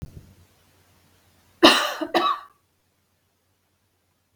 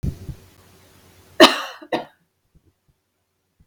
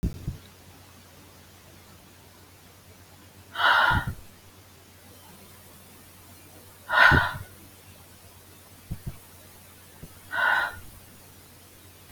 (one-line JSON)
{"three_cough_length": "4.4 s", "three_cough_amplitude": 32768, "three_cough_signal_mean_std_ratio": 0.26, "cough_length": "3.7 s", "cough_amplitude": 32768, "cough_signal_mean_std_ratio": 0.22, "exhalation_length": "12.1 s", "exhalation_amplitude": 22363, "exhalation_signal_mean_std_ratio": 0.35, "survey_phase": "beta (2021-08-13 to 2022-03-07)", "age": "65+", "gender": "Female", "wearing_mask": "No", "symptom_none": true, "smoker_status": "Ex-smoker", "respiratory_condition_asthma": false, "respiratory_condition_other": false, "recruitment_source": "REACT", "submission_delay": "2 days", "covid_test_result": "Negative", "covid_test_method": "RT-qPCR", "influenza_a_test_result": "Negative", "influenza_b_test_result": "Negative"}